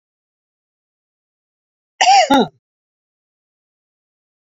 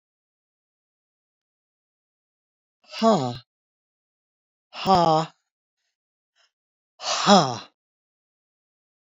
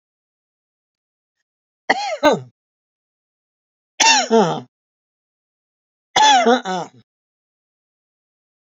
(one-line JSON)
{"cough_length": "4.5 s", "cough_amplitude": 31101, "cough_signal_mean_std_ratio": 0.25, "exhalation_length": "9.0 s", "exhalation_amplitude": 29149, "exhalation_signal_mean_std_ratio": 0.26, "three_cough_length": "8.7 s", "three_cough_amplitude": 32767, "three_cough_signal_mean_std_ratio": 0.32, "survey_phase": "beta (2021-08-13 to 2022-03-07)", "age": "65+", "gender": "Female", "wearing_mask": "No", "symptom_none": true, "smoker_status": "Ex-smoker", "respiratory_condition_asthma": false, "respiratory_condition_other": false, "recruitment_source": "REACT", "submission_delay": "2 days", "covid_test_result": "Negative", "covid_test_method": "RT-qPCR", "influenza_a_test_result": "Negative", "influenza_b_test_result": "Negative"}